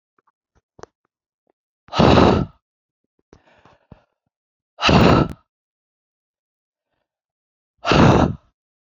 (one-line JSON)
{"exhalation_length": "9.0 s", "exhalation_amplitude": 32768, "exhalation_signal_mean_std_ratio": 0.32, "survey_phase": "beta (2021-08-13 to 2022-03-07)", "age": "18-44", "gender": "Female", "wearing_mask": "No", "symptom_none": true, "smoker_status": "Never smoked", "respiratory_condition_asthma": false, "respiratory_condition_other": false, "recruitment_source": "Test and Trace", "submission_delay": "2 days", "covid_test_result": "Negative", "covid_test_method": "RT-qPCR"}